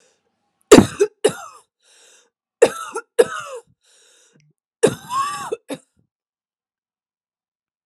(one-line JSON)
{"three_cough_length": "7.9 s", "three_cough_amplitude": 32768, "three_cough_signal_mean_std_ratio": 0.24, "survey_phase": "alpha (2021-03-01 to 2021-08-12)", "age": "45-64", "gender": "Female", "wearing_mask": "No", "symptom_cough_any": true, "symptom_shortness_of_breath": true, "symptom_fatigue": true, "symptom_change_to_sense_of_smell_or_taste": true, "symptom_onset": "4 days", "smoker_status": "Ex-smoker", "respiratory_condition_asthma": false, "respiratory_condition_other": false, "recruitment_source": "Test and Trace", "submission_delay": "2 days", "covid_test_result": "Positive", "covid_test_method": "RT-qPCR"}